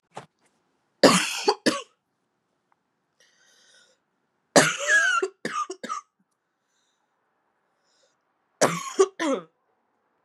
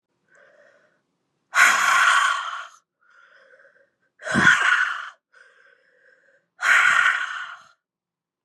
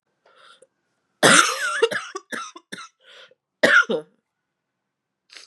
{
  "three_cough_length": "10.2 s",
  "three_cough_amplitude": 32427,
  "three_cough_signal_mean_std_ratio": 0.32,
  "exhalation_length": "8.4 s",
  "exhalation_amplitude": 27513,
  "exhalation_signal_mean_std_ratio": 0.44,
  "cough_length": "5.5 s",
  "cough_amplitude": 32509,
  "cough_signal_mean_std_ratio": 0.34,
  "survey_phase": "beta (2021-08-13 to 2022-03-07)",
  "age": "18-44",
  "gender": "Female",
  "wearing_mask": "No",
  "symptom_cough_any": true,
  "symptom_runny_or_blocked_nose": true,
  "symptom_shortness_of_breath": true,
  "symptom_sore_throat": true,
  "symptom_fatigue": true,
  "symptom_headache": true,
  "symptom_onset": "6 days",
  "smoker_status": "Never smoked",
  "respiratory_condition_asthma": false,
  "respiratory_condition_other": false,
  "recruitment_source": "Test and Trace",
  "submission_delay": "1 day",
  "covid_test_result": "Positive",
  "covid_test_method": "ePCR"
}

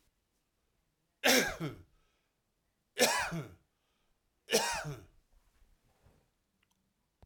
{
  "three_cough_length": "7.3 s",
  "three_cough_amplitude": 10023,
  "three_cough_signal_mean_std_ratio": 0.31,
  "survey_phase": "alpha (2021-03-01 to 2021-08-12)",
  "age": "65+",
  "gender": "Male",
  "wearing_mask": "No",
  "symptom_none": true,
  "smoker_status": "Ex-smoker",
  "respiratory_condition_asthma": false,
  "respiratory_condition_other": false,
  "recruitment_source": "REACT",
  "submission_delay": "2 days",
  "covid_test_result": "Negative",
  "covid_test_method": "RT-qPCR"
}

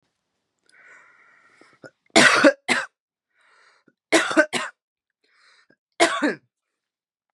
{
  "three_cough_length": "7.3 s",
  "three_cough_amplitude": 32148,
  "three_cough_signal_mean_std_ratio": 0.3,
  "survey_phase": "beta (2021-08-13 to 2022-03-07)",
  "age": "18-44",
  "gender": "Female",
  "wearing_mask": "No",
  "symptom_none": true,
  "smoker_status": "Current smoker (1 to 10 cigarettes per day)",
  "respiratory_condition_asthma": false,
  "respiratory_condition_other": false,
  "recruitment_source": "REACT",
  "submission_delay": "3 days",
  "covid_test_result": "Negative",
  "covid_test_method": "RT-qPCR",
  "influenza_a_test_result": "Negative",
  "influenza_b_test_result": "Negative"
}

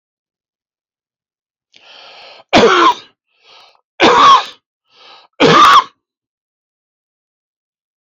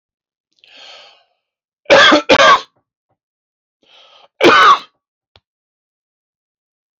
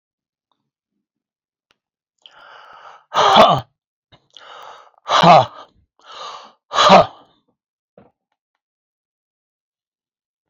{
  "three_cough_length": "8.1 s",
  "three_cough_amplitude": 30929,
  "three_cough_signal_mean_std_ratio": 0.36,
  "cough_length": "7.0 s",
  "cough_amplitude": 31188,
  "cough_signal_mean_std_ratio": 0.33,
  "exhalation_length": "10.5 s",
  "exhalation_amplitude": 29582,
  "exhalation_signal_mean_std_ratio": 0.27,
  "survey_phase": "alpha (2021-03-01 to 2021-08-12)",
  "age": "65+",
  "gender": "Male",
  "wearing_mask": "No",
  "symptom_none": true,
  "smoker_status": "Never smoked",
  "respiratory_condition_asthma": false,
  "respiratory_condition_other": false,
  "recruitment_source": "REACT",
  "submission_delay": "1 day",
  "covid_test_result": "Negative",
  "covid_test_method": "RT-qPCR"
}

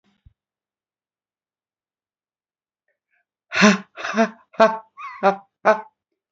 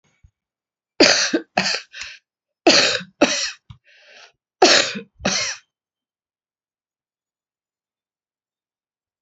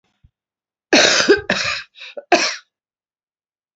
{
  "exhalation_length": "6.3 s",
  "exhalation_amplitude": 27689,
  "exhalation_signal_mean_std_ratio": 0.28,
  "three_cough_length": "9.2 s",
  "three_cough_amplitude": 32767,
  "three_cough_signal_mean_std_ratio": 0.32,
  "cough_length": "3.8 s",
  "cough_amplitude": 31646,
  "cough_signal_mean_std_ratio": 0.39,
  "survey_phase": "beta (2021-08-13 to 2022-03-07)",
  "age": "45-64",
  "gender": "Female",
  "wearing_mask": "Yes",
  "symptom_cough_any": true,
  "symptom_shortness_of_breath": true,
  "symptom_fatigue": true,
  "symptom_onset": "12 days",
  "smoker_status": "Current smoker (1 to 10 cigarettes per day)",
  "respiratory_condition_asthma": false,
  "respiratory_condition_other": false,
  "recruitment_source": "REACT",
  "submission_delay": "1 day",
  "covid_test_result": "Negative",
  "covid_test_method": "RT-qPCR"
}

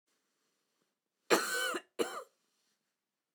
{
  "cough_length": "3.3 s",
  "cough_amplitude": 8539,
  "cough_signal_mean_std_ratio": 0.32,
  "survey_phase": "beta (2021-08-13 to 2022-03-07)",
  "age": "65+",
  "gender": "Female",
  "wearing_mask": "No",
  "symptom_none": true,
  "symptom_onset": "13 days",
  "smoker_status": "Ex-smoker",
  "respiratory_condition_asthma": true,
  "respiratory_condition_other": false,
  "recruitment_source": "REACT",
  "submission_delay": "1 day",
  "covid_test_result": "Negative",
  "covid_test_method": "RT-qPCR",
  "influenza_a_test_result": "Unknown/Void",
  "influenza_b_test_result": "Unknown/Void"
}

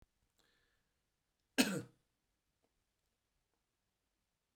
{
  "cough_length": "4.6 s",
  "cough_amplitude": 5505,
  "cough_signal_mean_std_ratio": 0.16,
  "survey_phase": "beta (2021-08-13 to 2022-03-07)",
  "age": "65+",
  "gender": "Male",
  "wearing_mask": "No",
  "symptom_none": true,
  "smoker_status": "Never smoked",
  "respiratory_condition_asthma": false,
  "respiratory_condition_other": false,
  "recruitment_source": "REACT",
  "submission_delay": "2 days",
  "covid_test_result": "Negative",
  "covid_test_method": "RT-qPCR"
}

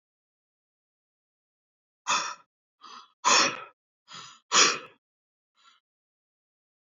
{
  "exhalation_length": "7.0 s",
  "exhalation_amplitude": 16234,
  "exhalation_signal_mean_std_ratio": 0.26,
  "survey_phase": "beta (2021-08-13 to 2022-03-07)",
  "age": "18-44",
  "gender": "Male",
  "wearing_mask": "No",
  "symptom_none": true,
  "smoker_status": "Never smoked",
  "respiratory_condition_asthma": false,
  "respiratory_condition_other": false,
  "recruitment_source": "REACT",
  "submission_delay": "1 day",
  "covid_test_result": "Negative",
  "covid_test_method": "RT-qPCR",
  "influenza_a_test_result": "Negative",
  "influenza_b_test_result": "Negative"
}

